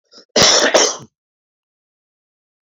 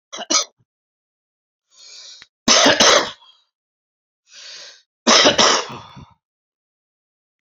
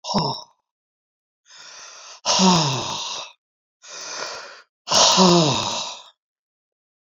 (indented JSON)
{
  "cough_length": "2.6 s",
  "cough_amplitude": 32767,
  "cough_signal_mean_std_ratio": 0.38,
  "three_cough_length": "7.4 s",
  "three_cough_amplitude": 32768,
  "three_cough_signal_mean_std_ratio": 0.35,
  "exhalation_length": "7.1 s",
  "exhalation_amplitude": 26295,
  "exhalation_signal_mean_std_ratio": 0.46,
  "survey_phase": "beta (2021-08-13 to 2022-03-07)",
  "age": "65+",
  "gender": "Male",
  "wearing_mask": "No",
  "symptom_cough_any": true,
  "smoker_status": "Never smoked",
  "respiratory_condition_asthma": true,
  "respiratory_condition_other": false,
  "recruitment_source": "REACT",
  "submission_delay": "1 day",
  "covid_test_result": "Negative",
  "covid_test_method": "RT-qPCR"
}